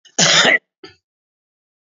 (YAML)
cough_length: 1.9 s
cough_amplitude: 31020
cough_signal_mean_std_ratio: 0.38
survey_phase: beta (2021-08-13 to 2022-03-07)
age: 65+
gender: Male
wearing_mask: 'No'
symptom_none: true
smoker_status: Never smoked
respiratory_condition_asthma: true
respiratory_condition_other: false
recruitment_source: REACT
submission_delay: 4 days
covid_test_result: Positive
covid_test_method: RT-qPCR
covid_ct_value: 33.4
covid_ct_gene: N gene
influenza_a_test_result: Negative
influenza_b_test_result: Negative